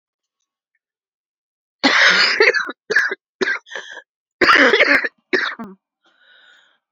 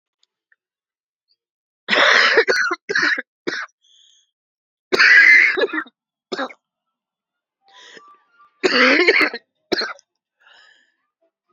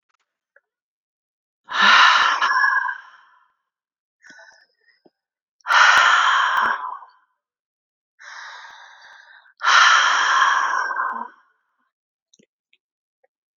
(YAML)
cough_length: 6.9 s
cough_amplitude: 32125
cough_signal_mean_std_ratio: 0.44
three_cough_length: 11.5 s
three_cough_amplitude: 30339
three_cough_signal_mean_std_ratio: 0.4
exhalation_length: 13.6 s
exhalation_amplitude: 27633
exhalation_signal_mean_std_ratio: 0.45
survey_phase: beta (2021-08-13 to 2022-03-07)
age: 18-44
gender: Female
wearing_mask: 'No'
symptom_cough_any: true
symptom_runny_or_blocked_nose: true
symptom_shortness_of_breath: true
symptom_sore_throat: true
symptom_fatigue: true
symptom_fever_high_temperature: true
symptom_headache: true
symptom_loss_of_taste: true
symptom_onset: 3 days
smoker_status: Ex-smoker
respiratory_condition_asthma: false
respiratory_condition_other: false
recruitment_source: Test and Trace
submission_delay: 2 days
covid_test_result: Positive
covid_test_method: RT-qPCR
covid_ct_value: 25.2
covid_ct_gene: ORF1ab gene